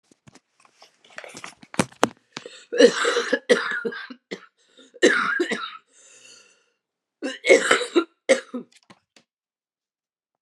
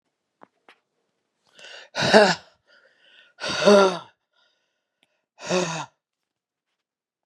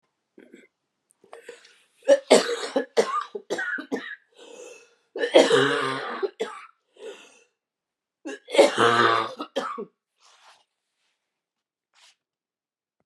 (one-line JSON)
{"cough_length": "10.4 s", "cough_amplitude": 32768, "cough_signal_mean_std_ratio": 0.35, "exhalation_length": "7.3 s", "exhalation_amplitude": 31965, "exhalation_signal_mean_std_ratio": 0.28, "three_cough_length": "13.1 s", "three_cough_amplitude": 29182, "three_cough_signal_mean_std_ratio": 0.36, "survey_phase": "beta (2021-08-13 to 2022-03-07)", "age": "45-64", "gender": "Female", "wearing_mask": "No", "symptom_cough_any": true, "symptom_runny_or_blocked_nose": true, "symptom_shortness_of_breath": true, "symptom_sore_throat": true, "symptom_fatigue": true, "symptom_fever_high_temperature": true, "symptom_change_to_sense_of_smell_or_taste": true, "symptom_loss_of_taste": true, "symptom_onset": "2 days", "smoker_status": "Ex-smoker", "respiratory_condition_asthma": false, "respiratory_condition_other": false, "recruitment_source": "Test and Trace", "submission_delay": "1 day", "covid_test_result": "Positive", "covid_test_method": "RT-qPCR", "covid_ct_value": 16.1, "covid_ct_gene": "ORF1ab gene"}